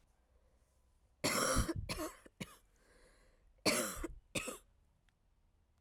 {"cough_length": "5.8 s", "cough_amplitude": 4085, "cough_signal_mean_std_ratio": 0.41, "survey_phase": "alpha (2021-03-01 to 2021-08-12)", "age": "18-44", "gender": "Female", "wearing_mask": "No", "symptom_cough_any": true, "symptom_new_continuous_cough": true, "symptom_shortness_of_breath": true, "symptom_fatigue": true, "symptom_headache": true, "symptom_change_to_sense_of_smell_or_taste": true, "symptom_loss_of_taste": true, "symptom_onset": "6 days", "smoker_status": "Never smoked", "respiratory_condition_asthma": false, "respiratory_condition_other": false, "recruitment_source": "Test and Trace", "submission_delay": "2 days", "covid_test_result": "Positive", "covid_test_method": "RT-qPCR", "covid_ct_value": 16.2, "covid_ct_gene": "ORF1ab gene", "covid_ct_mean": 17.3, "covid_viral_load": "2100000 copies/ml", "covid_viral_load_category": "High viral load (>1M copies/ml)"}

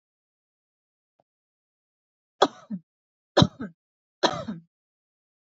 {"three_cough_length": "5.5 s", "three_cough_amplitude": 26040, "three_cough_signal_mean_std_ratio": 0.19, "survey_phase": "beta (2021-08-13 to 2022-03-07)", "age": "45-64", "gender": "Female", "wearing_mask": "No", "symptom_none": true, "smoker_status": "Ex-smoker", "respiratory_condition_asthma": false, "respiratory_condition_other": false, "recruitment_source": "REACT", "submission_delay": "1 day", "covid_test_result": "Negative", "covid_test_method": "RT-qPCR", "influenza_a_test_result": "Unknown/Void", "influenza_b_test_result": "Unknown/Void"}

